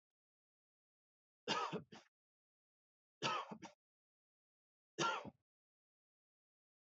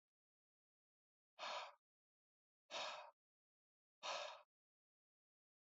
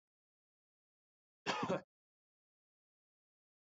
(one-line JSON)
{"three_cough_length": "6.9 s", "three_cough_amplitude": 1633, "three_cough_signal_mean_std_ratio": 0.29, "exhalation_length": "5.6 s", "exhalation_amplitude": 586, "exhalation_signal_mean_std_ratio": 0.34, "cough_length": "3.7 s", "cough_amplitude": 2055, "cough_signal_mean_std_ratio": 0.23, "survey_phase": "beta (2021-08-13 to 2022-03-07)", "age": "18-44", "gender": "Male", "wearing_mask": "No", "symptom_runny_or_blocked_nose": true, "smoker_status": "Never smoked", "respiratory_condition_asthma": false, "respiratory_condition_other": false, "recruitment_source": "Test and Trace", "submission_delay": "1 day", "covid_test_result": "Positive", "covid_test_method": "RT-qPCR", "covid_ct_value": 20.4, "covid_ct_gene": "ORF1ab gene"}